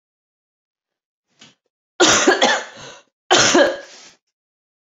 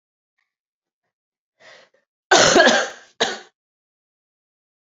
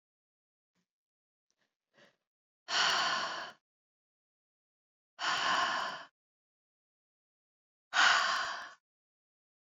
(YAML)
three_cough_length: 4.9 s
three_cough_amplitude: 32767
three_cough_signal_mean_std_ratio: 0.38
cough_length: 4.9 s
cough_amplitude: 32768
cough_signal_mean_std_ratio: 0.29
exhalation_length: 9.6 s
exhalation_amplitude: 6990
exhalation_signal_mean_std_ratio: 0.37
survey_phase: beta (2021-08-13 to 2022-03-07)
age: 45-64
gender: Female
wearing_mask: 'No'
symptom_cough_any: true
symptom_runny_or_blocked_nose: true
symptom_shortness_of_breath: true
symptom_fatigue: true
symptom_headache: true
symptom_change_to_sense_of_smell_or_taste: true
symptom_loss_of_taste: true
smoker_status: Never smoked
respiratory_condition_asthma: false
respiratory_condition_other: false
recruitment_source: Test and Trace
submission_delay: 2 days
covid_test_result: Positive
covid_test_method: RT-qPCR